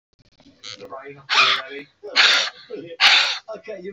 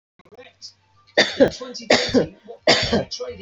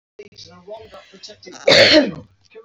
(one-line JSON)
{"exhalation_length": "3.9 s", "exhalation_amplitude": 28165, "exhalation_signal_mean_std_ratio": 0.49, "three_cough_length": "3.4 s", "three_cough_amplitude": 29393, "three_cough_signal_mean_std_ratio": 0.46, "cough_length": "2.6 s", "cough_amplitude": 29401, "cough_signal_mean_std_ratio": 0.37, "survey_phase": "beta (2021-08-13 to 2022-03-07)", "age": "45-64", "gender": "Female", "wearing_mask": "No", "symptom_none": true, "smoker_status": "Never smoked", "respiratory_condition_asthma": true, "respiratory_condition_other": false, "recruitment_source": "REACT", "submission_delay": "2 days", "covid_test_result": "Negative", "covid_test_method": "RT-qPCR", "influenza_a_test_result": "Negative", "influenza_b_test_result": "Negative"}